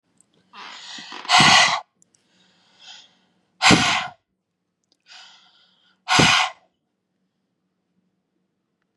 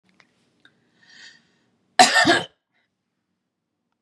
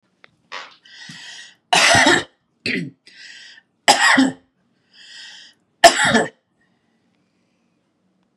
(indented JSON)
{
  "exhalation_length": "9.0 s",
  "exhalation_amplitude": 30486,
  "exhalation_signal_mean_std_ratio": 0.32,
  "cough_length": "4.0 s",
  "cough_amplitude": 32767,
  "cough_signal_mean_std_ratio": 0.25,
  "three_cough_length": "8.4 s",
  "three_cough_amplitude": 32768,
  "three_cough_signal_mean_std_ratio": 0.35,
  "survey_phase": "beta (2021-08-13 to 2022-03-07)",
  "age": "45-64",
  "gender": "Female",
  "wearing_mask": "No",
  "symptom_none": true,
  "smoker_status": "Never smoked",
  "respiratory_condition_asthma": false,
  "respiratory_condition_other": false,
  "recruitment_source": "REACT",
  "submission_delay": "1 day",
  "covid_test_result": "Negative",
  "covid_test_method": "RT-qPCR",
  "influenza_a_test_result": "Negative",
  "influenza_b_test_result": "Negative"
}